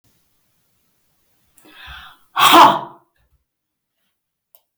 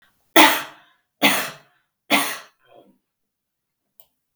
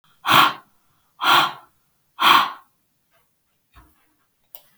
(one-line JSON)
{"cough_length": "4.8 s", "cough_amplitude": 32768, "cough_signal_mean_std_ratio": 0.25, "three_cough_length": "4.4 s", "three_cough_amplitude": 32768, "three_cough_signal_mean_std_ratio": 0.29, "exhalation_length": "4.8 s", "exhalation_amplitude": 32768, "exhalation_signal_mean_std_ratio": 0.33, "survey_phase": "beta (2021-08-13 to 2022-03-07)", "age": "45-64", "gender": "Female", "wearing_mask": "No", "symptom_none": true, "symptom_onset": "11 days", "smoker_status": "Never smoked", "respiratory_condition_asthma": false, "respiratory_condition_other": false, "recruitment_source": "REACT", "submission_delay": "1 day", "covid_test_result": "Negative", "covid_test_method": "RT-qPCR", "influenza_a_test_result": "Negative", "influenza_b_test_result": "Negative"}